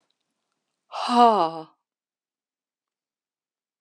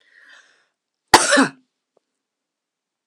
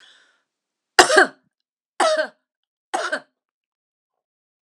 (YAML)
exhalation_length: 3.8 s
exhalation_amplitude: 20084
exhalation_signal_mean_std_ratio: 0.26
cough_length: 3.1 s
cough_amplitude: 32768
cough_signal_mean_std_ratio: 0.24
three_cough_length: 4.6 s
three_cough_amplitude: 32768
three_cough_signal_mean_std_ratio: 0.27
survey_phase: beta (2021-08-13 to 2022-03-07)
age: 65+
gender: Female
wearing_mask: 'No'
symptom_cough_any: true
symptom_sore_throat: true
symptom_fatigue: true
symptom_headache: true
symptom_onset: 4 days
smoker_status: Never smoked
respiratory_condition_asthma: false
respiratory_condition_other: false
recruitment_source: Test and Trace
submission_delay: 2 days
covid_test_result: Positive
covid_test_method: RT-qPCR
covid_ct_value: 23.1
covid_ct_gene: ORF1ab gene